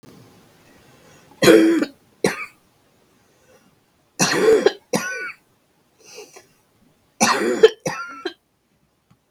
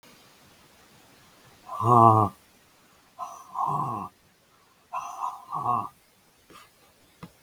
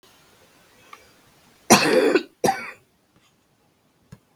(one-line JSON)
{"three_cough_length": "9.3 s", "three_cough_amplitude": 32767, "three_cough_signal_mean_std_ratio": 0.35, "exhalation_length": "7.4 s", "exhalation_amplitude": 22337, "exhalation_signal_mean_std_ratio": 0.33, "cough_length": "4.4 s", "cough_amplitude": 32768, "cough_signal_mean_std_ratio": 0.31, "survey_phase": "beta (2021-08-13 to 2022-03-07)", "age": "65+", "gender": "Female", "wearing_mask": "No", "symptom_cough_any": true, "symptom_runny_or_blocked_nose": true, "symptom_sore_throat": true, "symptom_fever_high_temperature": true, "symptom_headache": true, "smoker_status": "Ex-smoker", "respiratory_condition_asthma": false, "respiratory_condition_other": false, "recruitment_source": "Test and Trace", "submission_delay": "2 days", "covid_test_result": "Positive", "covid_test_method": "LFT"}